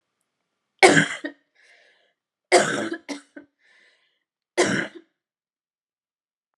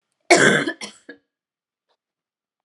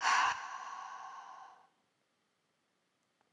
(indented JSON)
{
  "three_cough_length": "6.6 s",
  "three_cough_amplitude": 32710,
  "three_cough_signal_mean_std_ratio": 0.28,
  "cough_length": "2.6 s",
  "cough_amplitude": 32765,
  "cough_signal_mean_std_ratio": 0.3,
  "exhalation_length": "3.3 s",
  "exhalation_amplitude": 4722,
  "exhalation_signal_mean_std_ratio": 0.39,
  "survey_phase": "alpha (2021-03-01 to 2021-08-12)",
  "age": "18-44",
  "gender": "Female",
  "wearing_mask": "No",
  "symptom_cough_any": true,
  "symptom_fatigue": true,
  "symptom_headache": true,
  "symptom_change_to_sense_of_smell_or_taste": true,
  "symptom_loss_of_taste": true,
  "smoker_status": "Never smoked",
  "respiratory_condition_asthma": false,
  "respiratory_condition_other": false,
  "recruitment_source": "Test and Trace",
  "submission_delay": "4 days",
  "covid_test_result": "Positive",
  "covid_test_method": "RT-qPCR",
  "covid_ct_value": 24.9,
  "covid_ct_gene": "ORF1ab gene",
  "covid_ct_mean": 25.0,
  "covid_viral_load": "6500 copies/ml",
  "covid_viral_load_category": "Minimal viral load (< 10K copies/ml)"
}